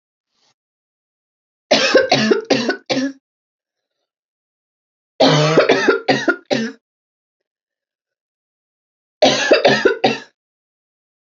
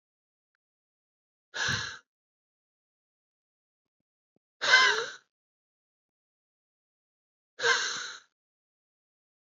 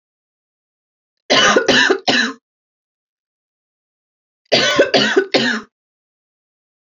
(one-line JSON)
{"three_cough_length": "11.3 s", "three_cough_amplitude": 29567, "three_cough_signal_mean_std_ratio": 0.42, "exhalation_length": "9.5 s", "exhalation_amplitude": 13918, "exhalation_signal_mean_std_ratio": 0.25, "cough_length": "7.0 s", "cough_amplitude": 32767, "cough_signal_mean_std_ratio": 0.41, "survey_phase": "beta (2021-08-13 to 2022-03-07)", "age": "18-44", "gender": "Female", "wearing_mask": "No", "symptom_runny_or_blocked_nose": true, "symptom_diarrhoea": true, "symptom_change_to_sense_of_smell_or_taste": true, "symptom_loss_of_taste": true, "symptom_onset": "6 days", "smoker_status": "Never smoked", "respiratory_condition_asthma": true, "respiratory_condition_other": false, "recruitment_source": "Test and Trace", "submission_delay": "1 day", "covid_test_result": "Positive", "covid_test_method": "RT-qPCR", "covid_ct_value": 25.3, "covid_ct_gene": "N gene"}